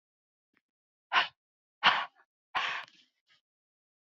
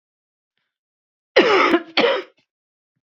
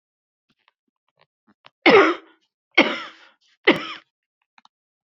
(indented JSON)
{
  "exhalation_length": "4.0 s",
  "exhalation_amplitude": 12848,
  "exhalation_signal_mean_std_ratio": 0.27,
  "cough_length": "3.1 s",
  "cough_amplitude": 30539,
  "cough_signal_mean_std_ratio": 0.38,
  "three_cough_length": "5.0 s",
  "three_cough_amplitude": 32665,
  "three_cough_signal_mean_std_ratio": 0.26,
  "survey_phase": "beta (2021-08-13 to 2022-03-07)",
  "age": "45-64",
  "gender": "Female",
  "wearing_mask": "No",
  "symptom_cough_any": true,
  "symptom_runny_or_blocked_nose": true,
  "symptom_sore_throat": true,
  "symptom_fatigue": true,
  "symptom_headache": true,
  "symptom_change_to_sense_of_smell_or_taste": true,
  "symptom_onset": "2 days",
  "smoker_status": "Never smoked",
  "respiratory_condition_asthma": false,
  "respiratory_condition_other": false,
  "recruitment_source": "Test and Trace",
  "submission_delay": "1 day",
  "covid_test_result": "Positive",
  "covid_test_method": "RT-qPCR",
  "covid_ct_value": 17.2,
  "covid_ct_gene": "N gene"
}